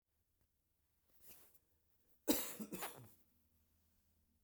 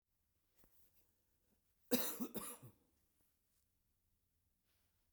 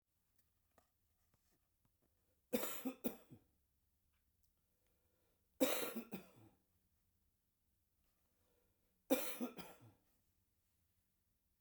exhalation_length: 4.4 s
exhalation_amplitude: 3086
exhalation_signal_mean_std_ratio: 0.27
cough_length: 5.1 s
cough_amplitude: 2857
cough_signal_mean_std_ratio: 0.25
three_cough_length: 11.6 s
three_cough_amplitude: 3080
three_cough_signal_mean_std_ratio: 0.26
survey_phase: beta (2021-08-13 to 2022-03-07)
age: 65+
gender: Male
wearing_mask: 'No'
symptom_none: true
smoker_status: Ex-smoker
respiratory_condition_asthma: false
respiratory_condition_other: false
recruitment_source: REACT
submission_delay: 3 days
covid_test_result: Negative
covid_test_method: RT-qPCR
influenza_a_test_result: Negative
influenza_b_test_result: Negative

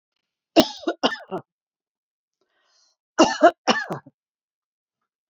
cough_length: 5.3 s
cough_amplitude: 28827
cough_signal_mean_std_ratio: 0.26
survey_phase: beta (2021-08-13 to 2022-03-07)
age: 65+
gender: Female
wearing_mask: 'No'
symptom_none: true
smoker_status: Ex-smoker
respiratory_condition_asthma: false
respiratory_condition_other: false
recruitment_source: REACT
submission_delay: 3 days
covid_test_result: Negative
covid_test_method: RT-qPCR
influenza_a_test_result: Negative
influenza_b_test_result: Negative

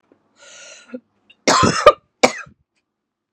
cough_length: 3.3 s
cough_amplitude: 32768
cough_signal_mean_std_ratio: 0.29
survey_phase: beta (2021-08-13 to 2022-03-07)
age: 45-64
gender: Female
wearing_mask: 'No'
symptom_cough_any: true
symptom_runny_or_blocked_nose: true
symptom_sore_throat: true
symptom_fatigue: true
symptom_fever_high_temperature: true
symptom_headache: true
symptom_change_to_sense_of_smell_or_taste: true
symptom_loss_of_taste: true
symptom_onset: 5 days
smoker_status: Never smoked
respiratory_condition_asthma: false
respiratory_condition_other: false
recruitment_source: Test and Trace
submission_delay: 1 day
covid_test_result: Positive
covid_test_method: RT-qPCR
covid_ct_value: 23.3
covid_ct_gene: ORF1ab gene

